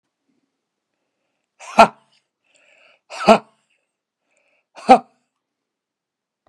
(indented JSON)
{
  "exhalation_length": "6.5 s",
  "exhalation_amplitude": 32768,
  "exhalation_signal_mean_std_ratio": 0.17,
  "survey_phase": "beta (2021-08-13 to 2022-03-07)",
  "age": "45-64",
  "gender": "Male",
  "wearing_mask": "No",
  "symptom_fatigue": true,
  "symptom_onset": "12 days",
  "smoker_status": "Ex-smoker",
  "respiratory_condition_asthma": true,
  "respiratory_condition_other": false,
  "recruitment_source": "REACT",
  "submission_delay": "3 days",
  "covid_test_result": "Negative",
  "covid_test_method": "RT-qPCR"
}